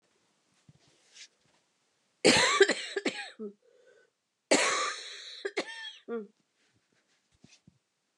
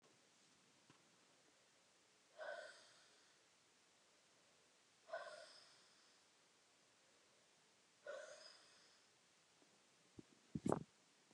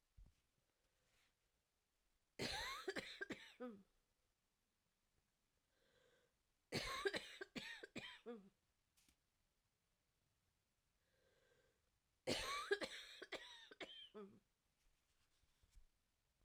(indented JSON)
{
  "cough_length": "8.2 s",
  "cough_amplitude": 13991,
  "cough_signal_mean_std_ratio": 0.33,
  "exhalation_length": "11.3 s",
  "exhalation_amplitude": 2737,
  "exhalation_signal_mean_std_ratio": 0.3,
  "three_cough_length": "16.4 s",
  "three_cough_amplitude": 1449,
  "three_cough_signal_mean_std_ratio": 0.36,
  "survey_phase": "alpha (2021-03-01 to 2021-08-12)",
  "age": "45-64",
  "gender": "Female",
  "wearing_mask": "No",
  "symptom_cough_any": true,
  "symptom_shortness_of_breath": true,
  "symptom_abdominal_pain": true,
  "symptom_diarrhoea": true,
  "symptom_fatigue": true,
  "symptom_fever_high_temperature": true,
  "symptom_headache": true,
  "symptom_onset": "5 days",
  "smoker_status": "Current smoker (e-cigarettes or vapes only)",
  "respiratory_condition_asthma": false,
  "respiratory_condition_other": false,
  "recruitment_source": "Test and Trace",
  "submission_delay": "3 days",
  "covid_test_result": "Positive",
  "covid_test_method": "RT-qPCR"
}